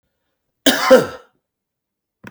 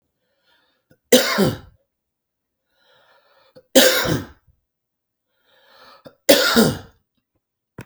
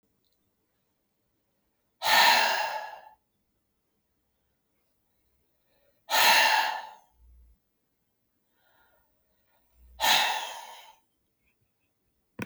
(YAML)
cough_length: 2.3 s
cough_amplitude: 32768
cough_signal_mean_std_ratio: 0.3
three_cough_length: 7.9 s
three_cough_amplitude: 32768
three_cough_signal_mean_std_ratio: 0.31
exhalation_length: 12.5 s
exhalation_amplitude: 13819
exhalation_signal_mean_std_ratio: 0.32
survey_phase: beta (2021-08-13 to 2022-03-07)
age: 45-64
gender: Male
wearing_mask: 'No'
symptom_new_continuous_cough: true
symptom_sore_throat: true
symptom_headache: true
symptom_onset: 3 days
smoker_status: Ex-smoker
respiratory_condition_asthma: false
respiratory_condition_other: false
recruitment_source: REACT
submission_delay: 1 day
covid_test_result: Positive
covid_test_method: RT-qPCR
covid_ct_value: 22.0
covid_ct_gene: E gene
influenza_a_test_result: Negative
influenza_b_test_result: Negative